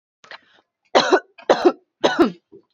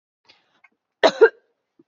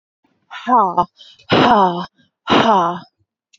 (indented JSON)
{
  "three_cough_length": "2.7 s",
  "three_cough_amplitude": 27613,
  "three_cough_signal_mean_std_ratio": 0.38,
  "cough_length": "1.9 s",
  "cough_amplitude": 27792,
  "cough_signal_mean_std_ratio": 0.23,
  "exhalation_length": "3.6 s",
  "exhalation_amplitude": 30011,
  "exhalation_signal_mean_std_ratio": 0.52,
  "survey_phase": "beta (2021-08-13 to 2022-03-07)",
  "age": "18-44",
  "gender": "Female",
  "wearing_mask": "No",
  "symptom_none": true,
  "smoker_status": "Prefer not to say",
  "respiratory_condition_asthma": false,
  "respiratory_condition_other": false,
  "recruitment_source": "REACT",
  "submission_delay": "2 days",
  "covid_test_result": "Negative",
  "covid_test_method": "RT-qPCR",
  "influenza_a_test_result": "Negative",
  "influenza_b_test_result": "Negative"
}